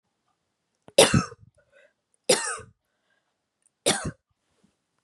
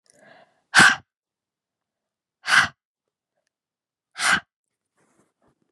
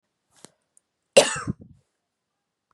{"three_cough_length": "5.0 s", "three_cough_amplitude": 24865, "three_cough_signal_mean_std_ratio": 0.25, "exhalation_length": "5.7 s", "exhalation_amplitude": 29710, "exhalation_signal_mean_std_ratio": 0.24, "cough_length": "2.7 s", "cough_amplitude": 30172, "cough_signal_mean_std_ratio": 0.19, "survey_phase": "beta (2021-08-13 to 2022-03-07)", "age": "18-44", "gender": "Female", "wearing_mask": "No", "symptom_none": true, "smoker_status": "Never smoked", "respiratory_condition_asthma": false, "respiratory_condition_other": false, "recruitment_source": "REACT", "submission_delay": "2 days", "covid_test_result": "Negative", "covid_test_method": "RT-qPCR", "influenza_a_test_result": "Negative", "influenza_b_test_result": "Negative"}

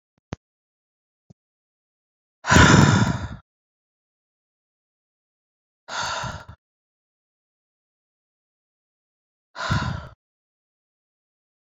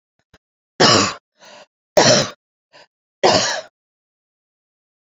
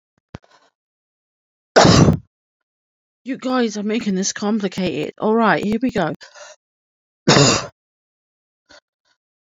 {"exhalation_length": "11.7 s", "exhalation_amplitude": 27677, "exhalation_signal_mean_std_ratio": 0.24, "three_cough_length": "5.1 s", "three_cough_amplitude": 32767, "three_cough_signal_mean_std_ratio": 0.34, "cough_length": "9.5 s", "cough_amplitude": 30569, "cough_signal_mean_std_ratio": 0.44, "survey_phase": "beta (2021-08-13 to 2022-03-07)", "age": "45-64", "gender": "Female", "wearing_mask": "No", "symptom_new_continuous_cough": true, "symptom_diarrhoea": true, "symptom_fatigue": true, "symptom_headache": true, "symptom_change_to_sense_of_smell_or_taste": true, "symptom_loss_of_taste": true, "symptom_onset": "13 days", "smoker_status": "Never smoked", "respiratory_condition_asthma": false, "respiratory_condition_other": false, "recruitment_source": "REACT", "submission_delay": "1 day", "covid_test_result": "Negative", "covid_test_method": "RT-qPCR"}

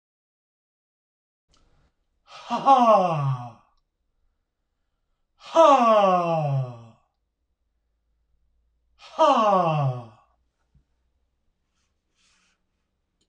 {"exhalation_length": "13.3 s", "exhalation_amplitude": 20682, "exhalation_signal_mean_std_ratio": 0.37, "survey_phase": "beta (2021-08-13 to 2022-03-07)", "age": "45-64", "gender": "Male", "wearing_mask": "No", "symptom_none": true, "smoker_status": "Ex-smoker", "respiratory_condition_asthma": false, "respiratory_condition_other": true, "recruitment_source": "REACT", "submission_delay": "2 days", "covid_test_result": "Negative", "covid_test_method": "RT-qPCR", "influenza_a_test_result": "Negative", "influenza_b_test_result": "Negative"}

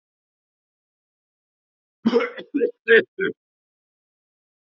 {"cough_length": "4.7 s", "cough_amplitude": 26172, "cough_signal_mean_std_ratio": 0.27, "survey_phase": "alpha (2021-03-01 to 2021-08-12)", "age": "18-44", "gender": "Male", "wearing_mask": "No", "symptom_cough_any": true, "symptom_new_continuous_cough": true, "symptom_shortness_of_breath": true, "symptom_abdominal_pain": true, "symptom_diarrhoea": true, "symptom_fatigue": true, "symptom_fever_high_temperature": true, "symptom_headache": true, "symptom_change_to_sense_of_smell_or_taste": true, "symptom_loss_of_taste": true, "smoker_status": "Current smoker (11 or more cigarettes per day)", "respiratory_condition_asthma": false, "respiratory_condition_other": false, "recruitment_source": "Test and Trace", "submission_delay": "1 day", "covid_test_result": "Positive", "covid_test_method": "RT-qPCR", "covid_ct_value": 20.6, "covid_ct_gene": "ORF1ab gene", "covid_ct_mean": 21.3, "covid_viral_load": "100000 copies/ml", "covid_viral_load_category": "Low viral load (10K-1M copies/ml)"}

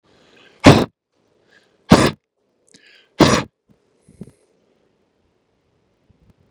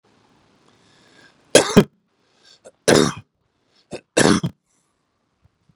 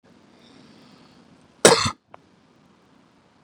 {"exhalation_length": "6.5 s", "exhalation_amplitude": 32768, "exhalation_signal_mean_std_ratio": 0.22, "three_cough_length": "5.8 s", "three_cough_amplitude": 32768, "three_cough_signal_mean_std_ratio": 0.25, "cough_length": "3.4 s", "cough_amplitude": 32768, "cough_signal_mean_std_ratio": 0.2, "survey_phase": "beta (2021-08-13 to 2022-03-07)", "age": "45-64", "gender": "Male", "wearing_mask": "No", "symptom_cough_any": true, "symptom_runny_or_blocked_nose": true, "symptom_sore_throat": true, "symptom_onset": "12 days", "smoker_status": "Never smoked", "respiratory_condition_asthma": false, "respiratory_condition_other": false, "recruitment_source": "REACT", "submission_delay": "2 days", "covid_test_result": "Negative", "covid_test_method": "RT-qPCR"}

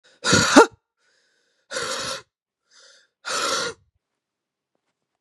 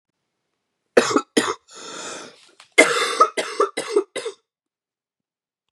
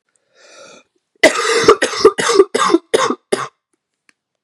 {"exhalation_length": "5.2 s", "exhalation_amplitude": 32767, "exhalation_signal_mean_std_ratio": 0.3, "three_cough_length": "5.7 s", "three_cough_amplitude": 32768, "three_cough_signal_mean_std_ratio": 0.36, "cough_length": "4.4 s", "cough_amplitude": 32768, "cough_signal_mean_std_ratio": 0.44, "survey_phase": "beta (2021-08-13 to 2022-03-07)", "age": "45-64", "gender": "Female", "wearing_mask": "No", "symptom_cough_any": true, "symptom_new_continuous_cough": true, "symptom_runny_or_blocked_nose": true, "symptom_shortness_of_breath": true, "symptom_sore_throat": true, "symptom_fatigue": true, "symptom_headache": true, "symptom_change_to_sense_of_smell_or_taste": true, "symptom_loss_of_taste": true, "symptom_onset": "7 days", "smoker_status": "Never smoked", "respiratory_condition_asthma": true, "respiratory_condition_other": false, "recruitment_source": "Test and Trace", "submission_delay": "4 days", "covid_test_result": "Positive", "covid_test_method": "RT-qPCR", "covid_ct_value": 16.0, "covid_ct_gene": "ORF1ab gene", "covid_ct_mean": 16.5, "covid_viral_load": "4000000 copies/ml", "covid_viral_load_category": "High viral load (>1M copies/ml)"}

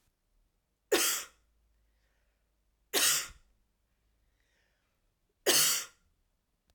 {"three_cough_length": "6.7 s", "three_cough_amplitude": 8985, "three_cough_signal_mean_std_ratio": 0.31, "survey_phase": "alpha (2021-03-01 to 2021-08-12)", "age": "45-64", "gender": "Female", "wearing_mask": "No", "symptom_none": true, "smoker_status": "Ex-smoker", "respiratory_condition_asthma": false, "respiratory_condition_other": false, "recruitment_source": "REACT", "submission_delay": "2 days", "covid_test_result": "Negative", "covid_test_method": "RT-qPCR"}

